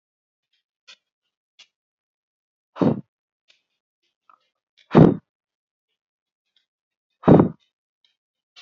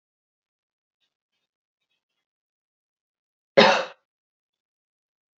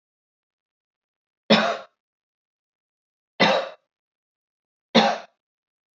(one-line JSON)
{"exhalation_length": "8.6 s", "exhalation_amplitude": 27794, "exhalation_signal_mean_std_ratio": 0.19, "cough_length": "5.4 s", "cough_amplitude": 27873, "cough_signal_mean_std_ratio": 0.16, "three_cough_length": "6.0 s", "three_cough_amplitude": 24531, "three_cough_signal_mean_std_ratio": 0.27, "survey_phase": "beta (2021-08-13 to 2022-03-07)", "age": "18-44", "gender": "Female", "wearing_mask": "No", "symptom_runny_or_blocked_nose": true, "symptom_abdominal_pain": true, "symptom_onset": "8 days", "smoker_status": "Never smoked", "respiratory_condition_asthma": false, "respiratory_condition_other": false, "recruitment_source": "REACT", "submission_delay": "1 day", "covid_test_result": "Negative", "covid_test_method": "RT-qPCR", "influenza_a_test_result": "Negative", "influenza_b_test_result": "Negative"}